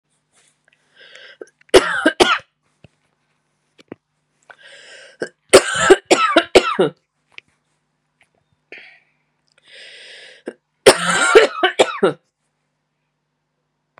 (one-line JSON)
{"three_cough_length": "14.0 s", "three_cough_amplitude": 32768, "three_cough_signal_mean_std_ratio": 0.3, "survey_phase": "beta (2021-08-13 to 2022-03-07)", "age": "45-64", "gender": "Female", "wearing_mask": "No", "symptom_cough_any": true, "symptom_runny_or_blocked_nose": true, "symptom_fatigue": true, "symptom_onset": "4 days", "smoker_status": "Never smoked", "respiratory_condition_asthma": false, "respiratory_condition_other": false, "recruitment_source": "Test and Trace", "submission_delay": "2 days", "covid_test_result": "Positive", "covid_test_method": "RT-qPCR", "covid_ct_value": 18.3, "covid_ct_gene": "N gene"}